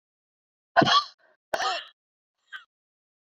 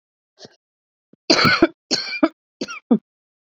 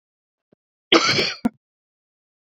{"exhalation_length": "3.3 s", "exhalation_amplitude": 18448, "exhalation_signal_mean_std_ratio": 0.29, "three_cough_length": "3.6 s", "three_cough_amplitude": 28506, "three_cough_signal_mean_std_ratio": 0.34, "cough_length": "2.6 s", "cough_amplitude": 28019, "cough_signal_mean_std_ratio": 0.31, "survey_phase": "beta (2021-08-13 to 2022-03-07)", "age": "45-64", "gender": "Female", "wearing_mask": "No", "symptom_cough_any": true, "symptom_runny_or_blocked_nose": true, "symptom_fatigue": true, "symptom_headache": true, "symptom_change_to_sense_of_smell_or_taste": true, "symptom_onset": "3 days", "smoker_status": "Never smoked", "respiratory_condition_asthma": false, "respiratory_condition_other": false, "recruitment_source": "Test and Trace", "submission_delay": "2 days", "covid_test_result": "Positive", "covid_test_method": "RT-qPCR", "covid_ct_value": 31.1, "covid_ct_gene": "ORF1ab gene", "covid_ct_mean": 31.7, "covid_viral_load": "41 copies/ml", "covid_viral_load_category": "Minimal viral load (< 10K copies/ml)"}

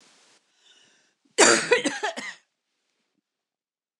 {"cough_length": "4.0 s", "cough_amplitude": 26500, "cough_signal_mean_std_ratio": 0.29, "survey_phase": "beta (2021-08-13 to 2022-03-07)", "age": "65+", "gender": "Female", "wearing_mask": "No", "symptom_none": true, "smoker_status": "Never smoked", "respiratory_condition_asthma": false, "respiratory_condition_other": false, "recruitment_source": "REACT", "submission_delay": "5 days", "covid_test_result": "Negative", "covid_test_method": "RT-qPCR", "influenza_a_test_result": "Negative", "influenza_b_test_result": "Negative"}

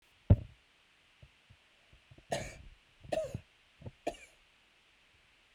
{"three_cough_length": "5.5 s", "three_cough_amplitude": 8362, "three_cough_signal_mean_std_ratio": 0.21, "survey_phase": "beta (2021-08-13 to 2022-03-07)", "age": "45-64", "gender": "Female", "wearing_mask": "No", "symptom_none": true, "symptom_onset": "2 days", "smoker_status": "Never smoked", "respiratory_condition_asthma": false, "respiratory_condition_other": false, "recruitment_source": "REACT", "submission_delay": "2 days", "covid_test_result": "Negative", "covid_test_method": "RT-qPCR"}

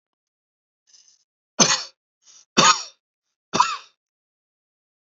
{"three_cough_length": "5.1 s", "three_cough_amplitude": 32265, "three_cough_signal_mean_std_ratio": 0.26, "survey_phase": "beta (2021-08-13 to 2022-03-07)", "age": "18-44", "gender": "Male", "wearing_mask": "No", "symptom_none": true, "smoker_status": "Never smoked", "respiratory_condition_asthma": false, "respiratory_condition_other": false, "recruitment_source": "REACT", "submission_delay": "3 days", "covid_test_result": "Negative", "covid_test_method": "RT-qPCR", "influenza_a_test_result": "Negative", "influenza_b_test_result": "Negative"}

